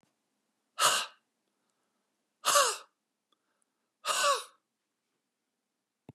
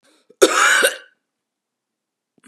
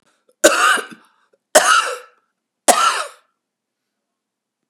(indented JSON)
{
  "exhalation_length": "6.1 s",
  "exhalation_amplitude": 8938,
  "exhalation_signal_mean_std_ratio": 0.3,
  "cough_length": "2.5 s",
  "cough_amplitude": 32768,
  "cough_signal_mean_std_ratio": 0.35,
  "three_cough_length": "4.7 s",
  "three_cough_amplitude": 32768,
  "three_cough_signal_mean_std_ratio": 0.37,
  "survey_phase": "beta (2021-08-13 to 2022-03-07)",
  "age": "45-64",
  "gender": "Female",
  "wearing_mask": "No",
  "symptom_none": true,
  "smoker_status": "Ex-smoker",
  "respiratory_condition_asthma": false,
  "respiratory_condition_other": true,
  "recruitment_source": "REACT",
  "submission_delay": "1 day",
  "covid_test_result": "Negative",
  "covid_test_method": "RT-qPCR",
  "influenza_a_test_result": "Negative",
  "influenza_b_test_result": "Negative"
}